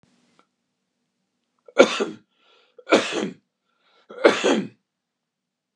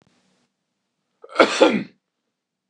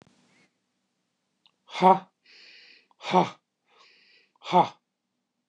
{"three_cough_length": "5.8 s", "three_cough_amplitude": 29204, "three_cough_signal_mean_std_ratio": 0.29, "cough_length": "2.7 s", "cough_amplitude": 29204, "cough_signal_mean_std_ratio": 0.28, "exhalation_length": "5.5 s", "exhalation_amplitude": 18756, "exhalation_signal_mean_std_ratio": 0.24, "survey_phase": "beta (2021-08-13 to 2022-03-07)", "age": "45-64", "gender": "Male", "wearing_mask": "No", "symptom_sore_throat": true, "smoker_status": "Ex-smoker", "respiratory_condition_asthma": false, "respiratory_condition_other": false, "recruitment_source": "REACT", "submission_delay": "4 days", "covid_test_result": "Negative", "covid_test_method": "RT-qPCR", "influenza_a_test_result": "Negative", "influenza_b_test_result": "Negative"}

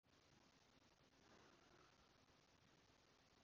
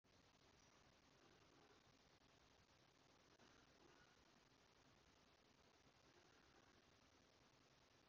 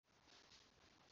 {"cough_length": "3.4 s", "cough_amplitude": 39, "cough_signal_mean_std_ratio": 1.02, "three_cough_length": "8.1 s", "three_cough_amplitude": 40, "three_cough_signal_mean_std_ratio": 1.05, "exhalation_length": "1.1 s", "exhalation_amplitude": 74, "exhalation_signal_mean_std_ratio": 0.94, "survey_phase": "beta (2021-08-13 to 2022-03-07)", "age": "45-64", "gender": "Female", "wearing_mask": "No", "symptom_cough_any": true, "symptom_new_continuous_cough": true, "symptom_runny_or_blocked_nose": true, "symptom_shortness_of_breath": true, "symptom_sore_throat": true, "symptom_fatigue": true, "symptom_headache": true, "symptom_change_to_sense_of_smell_or_taste": true, "symptom_onset": "5 days", "smoker_status": "Never smoked", "respiratory_condition_asthma": false, "respiratory_condition_other": false, "recruitment_source": "Test and Trace", "submission_delay": "1 day", "covid_test_result": "Positive", "covid_test_method": "RT-qPCR", "covid_ct_value": 25.9, "covid_ct_gene": "ORF1ab gene"}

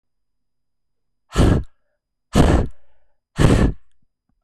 {"exhalation_length": "4.4 s", "exhalation_amplitude": 23268, "exhalation_signal_mean_std_ratio": 0.41, "survey_phase": "beta (2021-08-13 to 2022-03-07)", "age": "45-64", "gender": "Female", "wearing_mask": "No", "symptom_cough_any": true, "symptom_runny_or_blocked_nose": true, "symptom_abdominal_pain": true, "symptom_diarrhoea": true, "symptom_fatigue": true, "symptom_fever_high_temperature": true, "symptom_change_to_sense_of_smell_or_taste": true, "symptom_onset": "3 days", "smoker_status": "Ex-smoker", "respiratory_condition_asthma": false, "respiratory_condition_other": false, "recruitment_source": "Test and Trace", "submission_delay": "2 days", "covid_test_result": "Positive", "covid_test_method": "RT-qPCR"}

